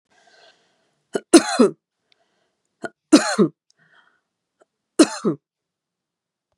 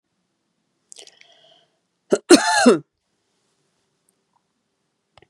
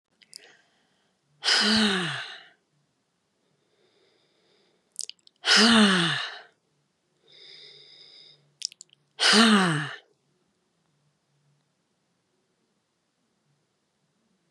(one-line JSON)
{"three_cough_length": "6.6 s", "three_cough_amplitude": 32767, "three_cough_signal_mean_std_ratio": 0.25, "cough_length": "5.3 s", "cough_amplitude": 32767, "cough_signal_mean_std_ratio": 0.23, "exhalation_length": "14.5 s", "exhalation_amplitude": 19475, "exhalation_signal_mean_std_ratio": 0.32, "survey_phase": "beta (2021-08-13 to 2022-03-07)", "age": "65+", "gender": "Female", "wearing_mask": "No", "symptom_none": true, "smoker_status": "Never smoked", "respiratory_condition_asthma": true, "respiratory_condition_other": false, "recruitment_source": "REACT", "submission_delay": "1 day", "covid_test_result": "Negative", "covid_test_method": "RT-qPCR", "influenza_a_test_result": "Unknown/Void", "influenza_b_test_result": "Unknown/Void"}